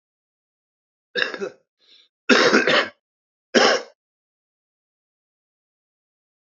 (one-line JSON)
{"three_cough_length": "6.5 s", "three_cough_amplitude": 27463, "three_cough_signal_mean_std_ratio": 0.3, "survey_phase": "beta (2021-08-13 to 2022-03-07)", "age": "45-64", "gender": "Male", "wearing_mask": "Yes", "symptom_cough_any": true, "symptom_runny_or_blocked_nose": true, "symptom_onset": "5 days", "smoker_status": "Current smoker (11 or more cigarettes per day)", "respiratory_condition_asthma": false, "respiratory_condition_other": false, "recruitment_source": "Test and Trace", "submission_delay": "4 days", "covid_test_result": "Positive", "covid_test_method": "LAMP"}